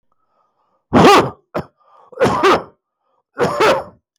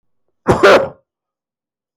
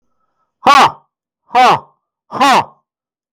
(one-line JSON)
{"three_cough_length": "4.2 s", "three_cough_amplitude": 32768, "three_cough_signal_mean_std_ratio": 0.46, "cough_length": "2.0 s", "cough_amplitude": 32767, "cough_signal_mean_std_ratio": 0.36, "exhalation_length": "3.3 s", "exhalation_amplitude": 32768, "exhalation_signal_mean_std_ratio": 0.44, "survey_phase": "beta (2021-08-13 to 2022-03-07)", "age": "65+", "gender": "Male", "wearing_mask": "No", "symptom_none": true, "symptom_onset": "4 days", "smoker_status": "Never smoked", "respiratory_condition_asthma": false, "respiratory_condition_other": false, "recruitment_source": "REACT", "submission_delay": "2 days", "covid_test_result": "Negative", "covid_test_method": "RT-qPCR"}